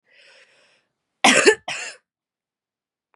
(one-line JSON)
{"cough_length": "3.2 s", "cough_amplitude": 31902, "cough_signal_mean_std_ratio": 0.27, "survey_phase": "beta (2021-08-13 to 2022-03-07)", "age": "18-44", "gender": "Female", "wearing_mask": "No", "symptom_runny_or_blocked_nose": true, "symptom_sore_throat": true, "symptom_abdominal_pain": true, "symptom_fatigue": true, "symptom_fever_high_temperature": true, "symptom_headache": true, "smoker_status": "Ex-smoker", "respiratory_condition_asthma": true, "respiratory_condition_other": false, "recruitment_source": "Test and Trace", "submission_delay": "1 day", "covid_test_result": "Positive", "covid_test_method": "RT-qPCR", "covid_ct_value": 25.4, "covid_ct_gene": "ORF1ab gene", "covid_ct_mean": 26.0, "covid_viral_load": "3000 copies/ml", "covid_viral_load_category": "Minimal viral load (< 10K copies/ml)"}